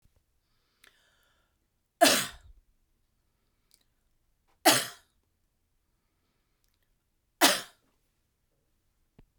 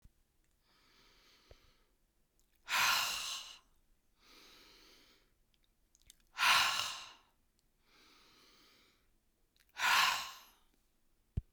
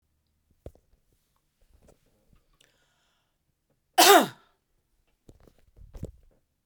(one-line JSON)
{"three_cough_length": "9.4 s", "three_cough_amplitude": 17122, "three_cough_signal_mean_std_ratio": 0.19, "exhalation_length": "11.5 s", "exhalation_amplitude": 5213, "exhalation_signal_mean_std_ratio": 0.32, "cough_length": "6.7 s", "cough_amplitude": 26557, "cough_signal_mean_std_ratio": 0.18, "survey_phase": "beta (2021-08-13 to 2022-03-07)", "age": "65+", "gender": "Female", "wearing_mask": "No", "symptom_none": true, "smoker_status": "Never smoked", "respiratory_condition_asthma": false, "respiratory_condition_other": false, "recruitment_source": "REACT", "submission_delay": "1 day", "covid_test_result": "Negative", "covid_test_method": "RT-qPCR", "influenza_a_test_result": "Negative", "influenza_b_test_result": "Negative"}